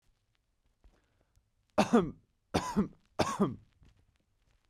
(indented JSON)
{
  "three_cough_length": "4.7 s",
  "three_cough_amplitude": 7388,
  "three_cough_signal_mean_std_ratio": 0.31,
  "survey_phase": "beta (2021-08-13 to 2022-03-07)",
  "age": "18-44",
  "gender": "Male",
  "wearing_mask": "No",
  "symptom_cough_any": true,
  "symptom_new_continuous_cough": true,
  "symptom_sore_throat": true,
  "symptom_fatigue": true,
  "symptom_headache": true,
  "symptom_onset": "3 days",
  "smoker_status": "Never smoked",
  "respiratory_condition_asthma": false,
  "respiratory_condition_other": false,
  "recruitment_source": "Test and Trace",
  "submission_delay": "2 days",
  "covid_test_result": "Positive",
  "covid_test_method": "RT-qPCR"
}